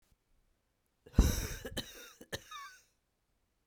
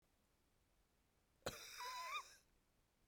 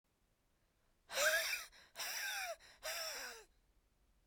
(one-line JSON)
{"three_cough_length": "3.7 s", "three_cough_amplitude": 10029, "three_cough_signal_mean_std_ratio": 0.26, "cough_length": "3.1 s", "cough_amplitude": 743, "cough_signal_mean_std_ratio": 0.44, "exhalation_length": "4.3 s", "exhalation_amplitude": 2495, "exhalation_signal_mean_std_ratio": 0.5, "survey_phase": "beta (2021-08-13 to 2022-03-07)", "age": "45-64", "gender": "Female", "wearing_mask": "No", "symptom_cough_any": true, "symptom_new_continuous_cough": true, "symptom_runny_or_blocked_nose": true, "symptom_shortness_of_breath": true, "symptom_sore_throat": true, "symptom_abdominal_pain": true, "symptom_fatigue": true, "symptom_fever_high_temperature": true, "symptom_headache": true, "symptom_change_to_sense_of_smell_or_taste": true, "symptom_other": true, "symptom_onset": "2 days", "smoker_status": "Current smoker (e-cigarettes or vapes only)", "respiratory_condition_asthma": false, "respiratory_condition_other": false, "recruitment_source": "Test and Trace", "submission_delay": "2 days", "covid_test_result": "Positive", "covid_test_method": "RT-qPCR"}